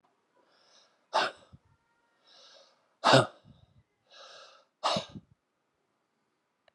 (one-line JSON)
{"exhalation_length": "6.7 s", "exhalation_amplitude": 15155, "exhalation_signal_mean_std_ratio": 0.23, "survey_phase": "beta (2021-08-13 to 2022-03-07)", "age": "65+", "gender": "Male", "wearing_mask": "No", "symptom_none": true, "smoker_status": "Ex-smoker", "respiratory_condition_asthma": false, "respiratory_condition_other": false, "recruitment_source": "REACT", "submission_delay": "6 days", "covid_test_result": "Negative", "covid_test_method": "RT-qPCR"}